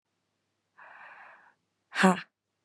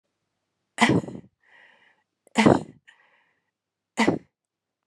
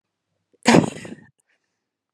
{
  "exhalation_length": "2.6 s",
  "exhalation_amplitude": 14330,
  "exhalation_signal_mean_std_ratio": 0.23,
  "three_cough_length": "4.9 s",
  "three_cough_amplitude": 24050,
  "three_cough_signal_mean_std_ratio": 0.28,
  "cough_length": "2.1 s",
  "cough_amplitude": 31447,
  "cough_signal_mean_std_ratio": 0.25,
  "survey_phase": "beta (2021-08-13 to 2022-03-07)",
  "age": "18-44",
  "gender": "Female",
  "wearing_mask": "No",
  "symptom_none": true,
  "smoker_status": "Never smoked",
  "respiratory_condition_asthma": false,
  "respiratory_condition_other": false,
  "recruitment_source": "REACT",
  "submission_delay": "3 days",
  "covid_test_result": "Negative",
  "covid_test_method": "RT-qPCR",
  "influenza_a_test_result": "Negative",
  "influenza_b_test_result": "Negative"
}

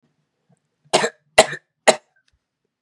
{
  "three_cough_length": "2.8 s",
  "three_cough_amplitude": 32768,
  "three_cough_signal_mean_std_ratio": 0.22,
  "survey_phase": "beta (2021-08-13 to 2022-03-07)",
  "age": "18-44",
  "gender": "Male",
  "wearing_mask": "No",
  "symptom_runny_or_blocked_nose": true,
  "symptom_sore_throat": true,
  "symptom_fatigue": true,
  "symptom_headache": true,
  "symptom_other": true,
  "smoker_status": "Never smoked",
  "respiratory_condition_asthma": true,
  "respiratory_condition_other": false,
  "recruitment_source": "Test and Trace",
  "submission_delay": "1 day",
  "covid_test_result": "Positive",
  "covid_test_method": "RT-qPCR"
}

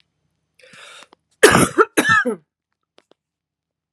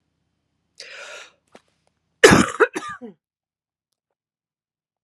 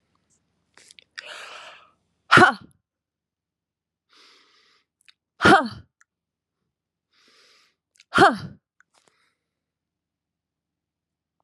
{
  "cough_length": "3.9 s",
  "cough_amplitude": 32768,
  "cough_signal_mean_std_ratio": 0.32,
  "three_cough_length": "5.0 s",
  "three_cough_amplitude": 32768,
  "three_cough_signal_mean_std_ratio": 0.21,
  "exhalation_length": "11.4 s",
  "exhalation_amplitude": 32631,
  "exhalation_signal_mean_std_ratio": 0.19,
  "survey_phase": "beta (2021-08-13 to 2022-03-07)",
  "age": "45-64",
  "gender": "Female",
  "wearing_mask": "No",
  "symptom_cough_any": true,
  "symptom_runny_or_blocked_nose": true,
  "symptom_diarrhoea": true,
  "symptom_fatigue": true,
  "symptom_fever_high_temperature": true,
  "symptom_headache": true,
  "symptom_change_to_sense_of_smell_or_taste": true,
  "symptom_onset": "4 days",
  "smoker_status": "Never smoked",
  "respiratory_condition_asthma": false,
  "respiratory_condition_other": false,
  "recruitment_source": "Test and Trace",
  "submission_delay": "1 day",
  "covid_test_result": "Positive",
  "covid_test_method": "ePCR"
}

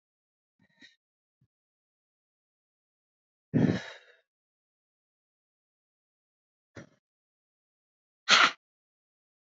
{
  "exhalation_length": "9.5 s",
  "exhalation_amplitude": 15540,
  "exhalation_signal_mean_std_ratio": 0.17,
  "survey_phase": "beta (2021-08-13 to 2022-03-07)",
  "age": "45-64",
  "gender": "Female",
  "wearing_mask": "No",
  "symptom_none": true,
  "smoker_status": "Ex-smoker",
  "respiratory_condition_asthma": false,
  "respiratory_condition_other": false,
  "recruitment_source": "REACT",
  "submission_delay": "3 days",
  "covid_test_result": "Negative",
  "covid_test_method": "RT-qPCR",
  "influenza_a_test_result": "Negative",
  "influenza_b_test_result": "Negative"
}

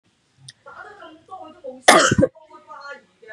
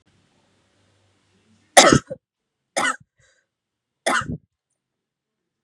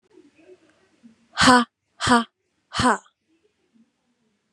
{
  "cough_length": "3.3 s",
  "cough_amplitude": 32768,
  "cough_signal_mean_std_ratio": 0.31,
  "three_cough_length": "5.6 s",
  "three_cough_amplitude": 32768,
  "three_cough_signal_mean_std_ratio": 0.22,
  "exhalation_length": "4.5 s",
  "exhalation_amplitude": 31552,
  "exhalation_signal_mean_std_ratio": 0.29,
  "survey_phase": "beta (2021-08-13 to 2022-03-07)",
  "age": "18-44",
  "gender": "Female",
  "wearing_mask": "No",
  "symptom_none": true,
  "smoker_status": "Never smoked",
  "respiratory_condition_asthma": false,
  "respiratory_condition_other": false,
  "recruitment_source": "REACT",
  "submission_delay": "1 day",
  "covid_test_result": "Negative",
  "covid_test_method": "RT-qPCR",
  "influenza_a_test_result": "Negative",
  "influenza_b_test_result": "Negative"
}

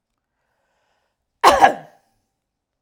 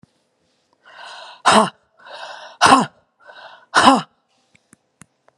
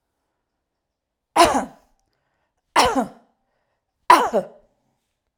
{
  "cough_length": "2.8 s",
  "cough_amplitude": 32768,
  "cough_signal_mean_std_ratio": 0.24,
  "exhalation_length": "5.4 s",
  "exhalation_amplitude": 32768,
  "exhalation_signal_mean_std_ratio": 0.31,
  "three_cough_length": "5.4 s",
  "three_cough_amplitude": 32768,
  "three_cough_signal_mean_std_ratio": 0.29,
  "survey_phase": "alpha (2021-03-01 to 2021-08-12)",
  "age": "45-64",
  "gender": "Female",
  "wearing_mask": "No",
  "symptom_none": true,
  "smoker_status": "Never smoked",
  "respiratory_condition_asthma": false,
  "respiratory_condition_other": false,
  "recruitment_source": "REACT",
  "submission_delay": "1 day",
  "covid_test_result": "Negative",
  "covid_test_method": "RT-qPCR"
}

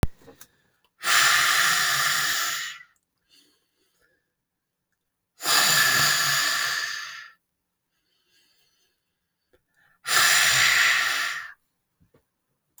{
  "exhalation_length": "12.8 s",
  "exhalation_amplitude": 19006,
  "exhalation_signal_mean_std_ratio": 0.52,
  "survey_phase": "alpha (2021-03-01 to 2021-08-12)",
  "age": "45-64",
  "gender": "Female",
  "wearing_mask": "No",
  "symptom_none": true,
  "smoker_status": "Current smoker (1 to 10 cigarettes per day)",
  "respiratory_condition_asthma": false,
  "respiratory_condition_other": false,
  "recruitment_source": "REACT",
  "submission_delay": "2 days",
  "covid_test_result": "Negative",
  "covid_test_method": "RT-qPCR"
}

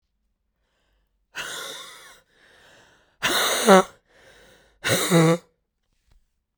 {
  "exhalation_length": "6.6 s",
  "exhalation_amplitude": 32768,
  "exhalation_signal_mean_std_ratio": 0.32,
  "survey_phase": "beta (2021-08-13 to 2022-03-07)",
  "age": "18-44",
  "gender": "Female",
  "wearing_mask": "Yes",
  "symptom_cough_any": true,
  "symptom_runny_or_blocked_nose": true,
  "symptom_sore_throat": true,
  "symptom_fatigue": true,
  "symptom_headache": true,
  "symptom_change_to_sense_of_smell_or_taste": true,
  "symptom_loss_of_taste": true,
  "symptom_onset": "6 days",
  "smoker_status": "Never smoked",
  "respiratory_condition_asthma": false,
  "respiratory_condition_other": false,
  "recruitment_source": "Test and Trace",
  "submission_delay": "1 day",
  "covid_test_result": "Positive",
  "covid_test_method": "RT-qPCR"
}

